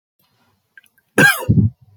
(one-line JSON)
{"cough_length": "2.0 s", "cough_amplitude": 29260, "cough_signal_mean_std_ratio": 0.39, "survey_phase": "beta (2021-08-13 to 2022-03-07)", "age": "18-44", "gender": "Male", "wearing_mask": "No", "symptom_cough_any": true, "symptom_runny_or_blocked_nose": true, "symptom_sore_throat": true, "symptom_onset": "4 days", "smoker_status": "Never smoked", "respiratory_condition_asthma": false, "respiratory_condition_other": false, "recruitment_source": "Test and Trace", "submission_delay": "1 day", "covid_test_result": "Positive", "covid_test_method": "RT-qPCR", "covid_ct_value": 17.6, "covid_ct_gene": "ORF1ab gene"}